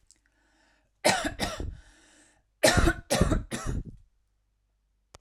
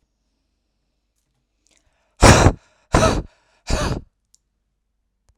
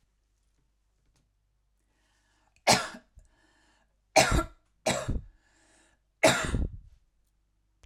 {"cough_length": "5.2 s", "cough_amplitude": 15425, "cough_signal_mean_std_ratio": 0.39, "exhalation_length": "5.4 s", "exhalation_amplitude": 32768, "exhalation_signal_mean_std_ratio": 0.28, "three_cough_length": "7.9 s", "three_cough_amplitude": 17493, "three_cough_signal_mean_std_ratio": 0.29, "survey_phase": "alpha (2021-03-01 to 2021-08-12)", "age": "18-44", "gender": "Female", "wearing_mask": "No", "symptom_none": true, "smoker_status": "Ex-smoker", "respiratory_condition_asthma": false, "respiratory_condition_other": false, "recruitment_source": "REACT", "submission_delay": "1 day", "covid_test_result": "Negative", "covid_test_method": "RT-qPCR"}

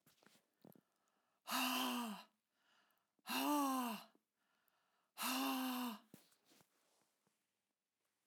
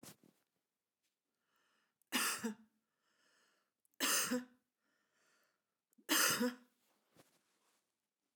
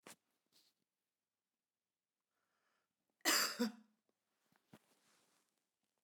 {"exhalation_length": "8.3 s", "exhalation_amplitude": 1405, "exhalation_signal_mean_std_ratio": 0.45, "three_cough_length": "8.4 s", "three_cough_amplitude": 3068, "three_cough_signal_mean_std_ratio": 0.31, "cough_length": "6.0 s", "cough_amplitude": 2882, "cough_signal_mean_std_ratio": 0.21, "survey_phase": "beta (2021-08-13 to 2022-03-07)", "age": "65+", "gender": "Female", "wearing_mask": "No", "symptom_none": true, "smoker_status": "Ex-smoker", "respiratory_condition_asthma": false, "respiratory_condition_other": false, "recruitment_source": "REACT", "submission_delay": "1 day", "covid_test_result": "Negative", "covid_test_method": "RT-qPCR", "influenza_a_test_result": "Negative", "influenza_b_test_result": "Negative"}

